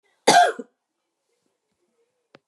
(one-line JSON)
{"cough_length": "2.5 s", "cough_amplitude": 25779, "cough_signal_mean_std_ratio": 0.26, "survey_phase": "beta (2021-08-13 to 2022-03-07)", "age": "65+", "gender": "Female", "wearing_mask": "No", "symptom_cough_any": true, "smoker_status": "Never smoked", "respiratory_condition_asthma": false, "respiratory_condition_other": false, "recruitment_source": "REACT", "submission_delay": "5 days", "covid_test_result": "Negative", "covid_test_method": "RT-qPCR", "influenza_a_test_result": "Negative", "influenza_b_test_result": "Negative"}